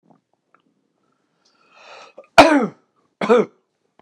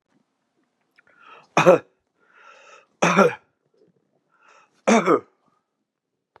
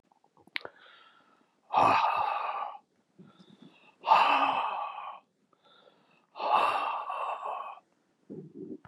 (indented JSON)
{
  "cough_length": "4.0 s",
  "cough_amplitude": 32768,
  "cough_signal_mean_std_ratio": 0.26,
  "three_cough_length": "6.4 s",
  "three_cough_amplitude": 32535,
  "three_cough_signal_mean_std_ratio": 0.27,
  "exhalation_length": "8.9 s",
  "exhalation_amplitude": 10858,
  "exhalation_signal_mean_std_ratio": 0.47,
  "survey_phase": "beta (2021-08-13 to 2022-03-07)",
  "age": "65+",
  "gender": "Male",
  "wearing_mask": "No",
  "symptom_cough_any": true,
  "symptom_runny_or_blocked_nose": true,
  "symptom_sore_throat": true,
  "symptom_fatigue": true,
  "smoker_status": "Never smoked",
  "respiratory_condition_asthma": false,
  "respiratory_condition_other": false,
  "recruitment_source": "Test and Trace",
  "submission_delay": "1 day",
  "covid_test_result": "Positive",
  "covid_test_method": "RT-qPCR",
  "covid_ct_value": 19.6,
  "covid_ct_gene": "ORF1ab gene",
  "covid_ct_mean": 19.8,
  "covid_viral_load": "320000 copies/ml",
  "covid_viral_load_category": "Low viral load (10K-1M copies/ml)"
}